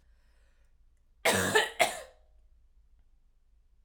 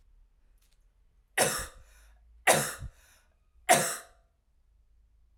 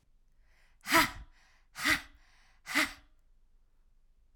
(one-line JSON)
{"cough_length": "3.8 s", "cough_amplitude": 11717, "cough_signal_mean_std_ratio": 0.33, "three_cough_length": "5.4 s", "three_cough_amplitude": 16309, "three_cough_signal_mean_std_ratio": 0.3, "exhalation_length": "4.4 s", "exhalation_amplitude": 10460, "exhalation_signal_mean_std_ratio": 0.31, "survey_phase": "alpha (2021-03-01 to 2021-08-12)", "age": "18-44", "gender": "Female", "wearing_mask": "No", "symptom_headache": true, "symptom_onset": "3 days", "smoker_status": "Current smoker (1 to 10 cigarettes per day)", "respiratory_condition_asthma": false, "respiratory_condition_other": false, "recruitment_source": "Test and Trace", "submission_delay": "1 day", "covid_test_result": "Positive", "covid_test_method": "RT-qPCR"}